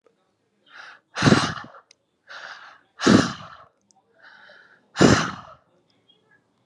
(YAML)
exhalation_length: 6.7 s
exhalation_amplitude: 29498
exhalation_signal_mean_std_ratio: 0.3
survey_phase: alpha (2021-03-01 to 2021-08-12)
age: 18-44
gender: Female
wearing_mask: 'No'
symptom_headache: true
smoker_status: Ex-smoker
respiratory_condition_asthma: false
respiratory_condition_other: false
recruitment_source: Test and Trace
submission_delay: 2 days
covid_test_result: Positive
covid_test_method: RT-qPCR
covid_ct_value: 27.4
covid_ct_gene: N gene
covid_ct_mean: 27.7
covid_viral_load: 830 copies/ml
covid_viral_load_category: Minimal viral load (< 10K copies/ml)